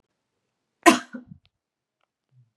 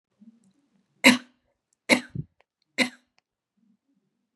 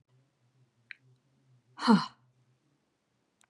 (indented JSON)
{
  "cough_length": "2.6 s",
  "cough_amplitude": 32767,
  "cough_signal_mean_std_ratio": 0.16,
  "three_cough_length": "4.4 s",
  "three_cough_amplitude": 28828,
  "three_cough_signal_mean_std_ratio": 0.2,
  "exhalation_length": "3.5 s",
  "exhalation_amplitude": 11889,
  "exhalation_signal_mean_std_ratio": 0.19,
  "survey_phase": "beta (2021-08-13 to 2022-03-07)",
  "age": "18-44",
  "gender": "Female",
  "wearing_mask": "No",
  "symptom_none": true,
  "smoker_status": "Never smoked",
  "respiratory_condition_asthma": false,
  "respiratory_condition_other": false,
  "recruitment_source": "REACT",
  "submission_delay": "1 day",
  "covid_test_result": "Negative",
  "covid_test_method": "RT-qPCR",
  "influenza_a_test_result": "Unknown/Void",
  "influenza_b_test_result": "Unknown/Void"
}